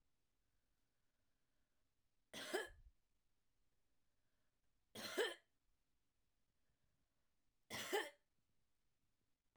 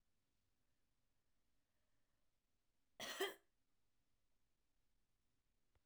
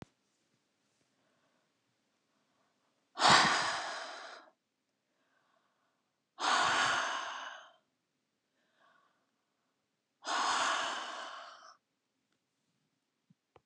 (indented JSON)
{
  "three_cough_length": "9.6 s",
  "three_cough_amplitude": 1200,
  "three_cough_signal_mean_std_ratio": 0.27,
  "cough_length": "5.9 s",
  "cough_amplitude": 1180,
  "cough_signal_mean_std_ratio": 0.22,
  "exhalation_length": "13.7 s",
  "exhalation_amplitude": 8777,
  "exhalation_signal_mean_std_ratio": 0.34,
  "survey_phase": "alpha (2021-03-01 to 2021-08-12)",
  "age": "45-64",
  "gender": "Female",
  "wearing_mask": "No",
  "symptom_none": true,
  "smoker_status": "Never smoked",
  "respiratory_condition_asthma": true,
  "respiratory_condition_other": false,
  "recruitment_source": "REACT",
  "submission_delay": "1 day",
  "covid_test_result": "Negative",
  "covid_test_method": "RT-qPCR"
}